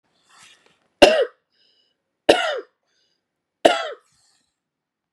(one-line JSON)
{"three_cough_length": "5.1 s", "three_cough_amplitude": 32768, "three_cough_signal_mean_std_ratio": 0.25, "survey_phase": "beta (2021-08-13 to 2022-03-07)", "age": "45-64", "gender": "Female", "wearing_mask": "No", "symptom_runny_or_blocked_nose": true, "symptom_sore_throat": true, "symptom_fatigue": true, "symptom_headache": true, "smoker_status": "Never smoked", "respiratory_condition_asthma": false, "respiratory_condition_other": false, "recruitment_source": "REACT", "submission_delay": "1 day", "covid_test_result": "Positive", "covid_test_method": "RT-qPCR", "covid_ct_value": 19.0, "covid_ct_gene": "E gene", "influenza_a_test_result": "Negative", "influenza_b_test_result": "Negative"}